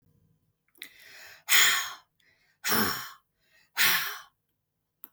{"exhalation_length": "5.1 s", "exhalation_amplitude": 16860, "exhalation_signal_mean_std_ratio": 0.37, "survey_phase": "beta (2021-08-13 to 2022-03-07)", "age": "45-64", "gender": "Female", "wearing_mask": "No", "symptom_none": true, "smoker_status": "Ex-smoker", "respiratory_condition_asthma": false, "respiratory_condition_other": false, "recruitment_source": "REACT", "submission_delay": "1 day", "covid_test_result": "Negative", "covid_test_method": "RT-qPCR", "influenza_a_test_result": "Negative", "influenza_b_test_result": "Negative"}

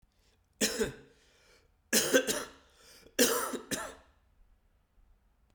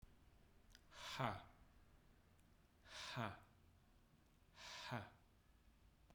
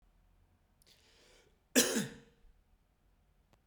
{"three_cough_length": "5.5 s", "three_cough_amplitude": 11270, "three_cough_signal_mean_std_ratio": 0.37, "exhalation_length": "6.1 s", "exhalation_amplitude": 1239, "exhalation_signal_mean_std_ratio": 0.45, "cough_length": "3.7 s", "cough_amplitude": 7807, "cough_signal_mean_std_ratio": 0.24, "survey_phase": "alpha (2021-03-01 to 2021-08-12)", "age": "45-64", "gender": "Male", "wearing_mask": "No", "symptom_cough_any": true, "symptom_new_continuous_cough": true, "symptom_shortness_of_breath": true, "symptom_fatigue": true, "symptom_headache": true, "symptom_change_to_sense_of_smell_or_taste": true, "symptom_loss_of_taste": true, "symptom_onset": "2 days", "smoker_status": "Ex-smoker", "respiratory_condition_asthma": false, "respiratory_condition_other": false, "recruitment_source": "Test and Trace", "submission_delay": "2 days", "covid_test_result": "Positive", "covid_test_method": "RT-qPCR", "covid_ct_value": 13.9, "covid_ct_gene": "ORF1ab gene", "covid_ct_mean": 14.2, "covid_viral_load": "22000000 copies/ml", "covid_viral_load_category": "High viral load (>1M copies/ml)"}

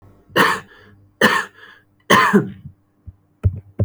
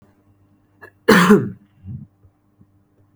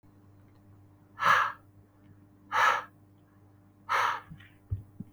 {"three_cough_length": "3.8 s", "three_cough_amplitude": 32768, "three_cough_signal_mean_std_ratio": 0.42, "cough_length": "3.2 s", "cough_amplitude": 32768, "cough_signal_mean_std_ratio": 0.3, "exhalation_length": "5.1 s", "exhalation_amplitude": 9824, "exhalation_signal_mean_std_ratio": 0.38, "survey_phase": "beta (2021-08-13 to 2022-03-07)", "age": "18-44", "gender": "Male", "wearing_mask": "No", "symptom_none": true, "smoker_status": "Never smoked", "respiratory_condition_asthma": false, "respiratory_condition_other": false, "recruitment_source": "REACT", "submission_delay": "3 days", "covid_test_result": "Negative", "covid_test_method": "RT-qPCR", "influenza_a_test_result": "Negative", "influenza_b_test_result": "Negative"}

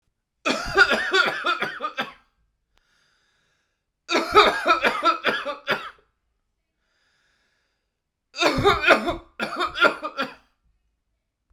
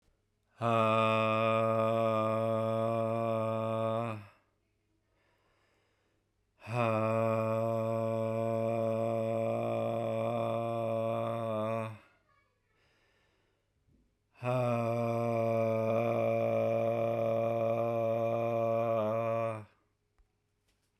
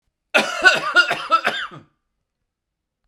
{"three_cough_length": "11.5 s", "three_cough_amplitude": 32767, "three_cough_signal_mean_std_ratio": 0.43, "exhalation_length": "21.0 s", "exhalation_amplitude": 4886, "exhalation_signal_mean_std_ratio": 0.83, "cough_length": "3.1 s", "cough_amplitude": 32767, "cough_signal_mean_std_ratio": 0.42, "survey_phase": "beta (2021-08-13 to 2022-03-07)", "age": "45-64", "gender": "Male", "wearing_mask": "No", "symptom_none": true, "smoker_status": "Never smoked", "respiratory_condition_asthma": false, "respiratory_condition_other": false, "recruitment_source": "REACT", "submission_delay": "2 days", "covid_test_result": "Negative", "covid_test_method": "RT-qPCR", "influenza_a_test_result": "Negative", "influenza_b_test_result": "Negative"}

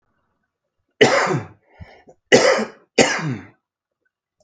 {"three_cough_length": "4.4 s", "three_cough_amplitude": 32768, "three_cough_signal_mean_std_ratio": 0.38, "survey_phase": "beta (2021-08-13 to 2022-03-07)", "age": "45-64", "gender": "Male", "wearing_mask": "No", "symptom_cough_any": true, "symptom_runny_or_blocked_nose": true, "symptom_sore_throat": true, "symptom_fatigue": true, "symptom_headache": true, "symptom_change_to_sense_of_smell_or_taste": true, "smoker_status": "Current smoker (11 or more cigarettes per day)", "respiratory_condition_asthma": false, "respiratory_condition_other": false, "recruitment_source": "Test and Trace", "submission_delay": "1 day", "covid_test_result": "Negative", "covid_test_method": "RT-qPCR"}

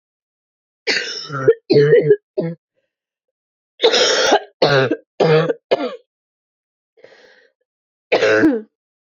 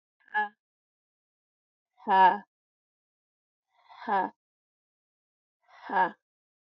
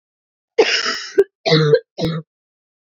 {"three_cough_length": "9.0 s", "three_cough_amplitude": 30896, "three_cough_signal_mean_std_ratio": 0.47, "exhalation_length": "6.7 s", "exhalation_amplitude": 11497, "exhalation_signal_mean_std_ratio": 0.27, "cough_length": "3.0 s", "cough_amplitude": 27273, "cough_signal_mean_std_ratio": 0.45, "survey_phase": "beta (2021-08-13 to 2022-03-07)", "age": "18-44", "wearing_mask": "No", "symptom_cough_any": true, "symptom_runny_or_blocked_nose": true, "symptom_shortness_of_breath": true, "symptom_sore_throat": true, "symptom_fatigue": true, "symptom_fever_high_temperature": true, "symptom_headache": true, "symptom_change_to_sense_of_smell_or_taste": true, "symptom_loss_of_taste": true, "symptom_onset": "4 days", "smoker_status": "Current smoker (1 to 10 cigarettes per day)", "respiratory_condition_asthma": false, "respiratory_condition_other": false, "recruitment_source": "Test and Trace", "submission_delay": "1 day", "covid_test_result": "Positive", "covid_test_method": "RT-qPCR", "covid_ct_value": 15.2, "covid_ct_gene": "ORF1ab gene"}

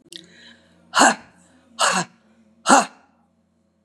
{"exhalation_length": "3.8 s", "exhalation_amplitude": 32767, "exhalation_signal_mean_std_ratio": 0.32, "survey_phase": "beta (2021-08-13 to 2022-03-07)", "age": "65+", "gender": "Female", "wearing_mask": "No", "symptom_none": true, "smoker_status": "Never smoked", "respiratory_condition_asthma": false, "respiratory_condition_other": false, "recruitment_source": "REACT", "submission_delay": "5 days", "covid_test_result": "Negative", "covid_test_method": "RT-qPCR", "influenza_a_test_result": "Negative", "influenza_b_test_result": "Negative"}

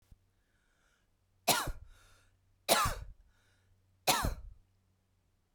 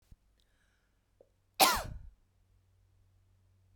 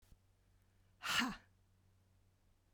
{"three_cough_length": "5.5 s", "three_cough_amplitude": 9313, "three_cough_signal_mean_std_ratio": 0.32, "cough_length": "3.8 s", "cough_amplitude": 12109, "cough_signal_mean_std_ratio": 0.21, "exhalation_length": "2.7 s", "exhalation_amplitude": 2410, "exhalation_signal_mean_std_ratio": 0.31, "survey_phase": "beta (2021-08-13 to 2022-03-07)", "age": "45-64", "gender": "Female", "wearing_mask": "No", "symptom_sore_throat": true, "smoker_status": "Never smoked", "respiratory_condition_asthma": false, "respiratory_condition_other": false, "recruitment_source": "Test and Trace", "submission_delay": "2 days", "covid_test_result": "Negative", "covid_test_method": "RT-qPCR"}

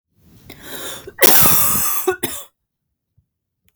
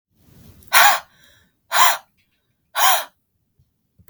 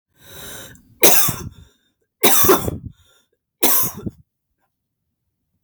{"cough_length": "3.8 s", "cough_amplitude": 32768, "cough_signal_mean_std_ratio": 0.45, "exhalation_length": "4.1 s", "exhalation_amplitude": 32768, "exhalation_signal_mean_std_ratio": 0.34, "three_cough_length": "5.6 s", "three_cough_amplitude": 32768, "three_cough_signal_mean_std_ratio": 0.38, "survey_phase": "beta (2021-08-13 to 2022-03-07)", "age": "18-44", "gender": "Female", "wearing_mask": "No", "symptom_cough_any": true, "symptom_onset": "4 days", "smoker_status": "Ex-smoker", "respiratory_condition_asthma": true, "respiratory_condition_other": false, "recruitment_source": "REACT", "submission_delay": "1 day", "covid_test_result": "Negative", "covid_test_method": "RT-qPCR"}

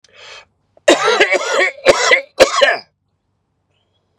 {"cough_length": "4.2 s", "cough_amplitude": 32768, "cough_signal_mean_std_ratio": 0.47, "survey_phase": "beta (2021-08-13 to 2022-03-07)", "age": "18-44", "gender": "Male", "wearing_mask": "No", "symptom_none": true, "symptom_onset": "8 days", "smoker_status": "Never smoked", "respiratory_condition_asthma": false, "respiratory_condition_other": false, "recruitment_source": "REACT", "submission_delay": "3 days", "covid_test_result": "Positive", "covid_test_method": "RT-qPCR", "covid_ct_value": 24.7, "covid_ct_gene": "E gene", "influenza_a_test_result": "Negative", "influenza_b_test_result": "Negative"}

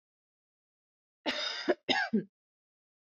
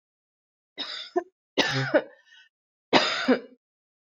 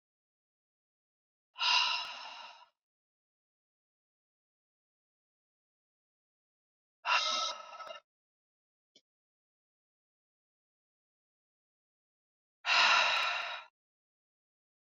{"cough_length": "3.1 s", "cough_amplitude": 5921, "cough_signal_mean_std_ratio": 0.36, "three_cough_length": "4.2 s", "three_cough_amplitude": 26899, "three_cough_signal_mean_std_ratio": 0.38, "exhalation_length": "14.8 s", "exhalation_amplitude": 7000, "exhalation_signal_mean_std_ratio": 0.28, "survey_phase": "beta (2021-08-13 to 2022-03-07)", "age": "18-44", "gender": "Female", "wearing_mask": "No", "symptom_none": true, "smoker_status": "Ex-smoker", "respiratory_condition_asthma": false, "respiratory_condition_other": false, "recruitment_source": "REACT", "submission_delay": "2 days", "covid_test_result": "Negative", "covid_test_method": "RT-qPCR", "influenza_a_test_result": "Negative", "influenza_b_test_result": "Negative"}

